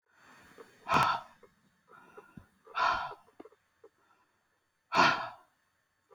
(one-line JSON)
{"exhalation_length": "6.1 s", "exhalation_amplitude": 7926, "exhalation_signal_mean_std_ratio": 0.33, "survey_phase": "beta (2021-08-13 to 2022-03-07)", "age": "65+", "gender": "Female", "wearing_mask": "No", "symptom_cough_any": true, "symptom_runny_or_blocked_nose": true, "symptom_onset": "5 days", "smoker_status": "Ex-smoker", "respiratory_condition_asthma": false, "respiratory_condition_other": false, "recruitment_source": "REACT", "submission_delay": "7 days", "covid_test_result": "Negative", "covid_test_method": "RT-qPCR"}